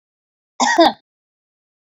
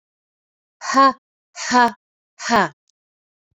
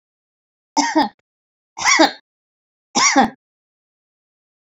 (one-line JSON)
{"cough_length": "2.0 s", "cough_amplitude": 27554, "cough_signal_mean_std_ratio": 0.31, "exhalation_length": "3.6 s", "exhalation_amplitude": 27527, "exhalation_signal_mean_std_ratio": 0.35, "three_cough_length": "4.6 s", "three_cough_amplitude": 28542, "three_cough_signal_mean_std_ratio": 0.35, "survey_phase": "beta (2021-08-13 to 2022-03-07)", "age": "45-64", "gender": "Female", "wearing_mask": "No", "symptom_headache": true, "smoker_status": "Never smoked", "respiratory_condition_asthma": false, "respiratory_condition_other": false, "recruitment_source": "REACT", "submission_delay": "2 days", "covid_test_result": "Negative", "covid_test_method": "RT-qPCR", "influenza_a_test_result": "Unknown/Void", "influenza_b_test_result": "Unknown/Void"}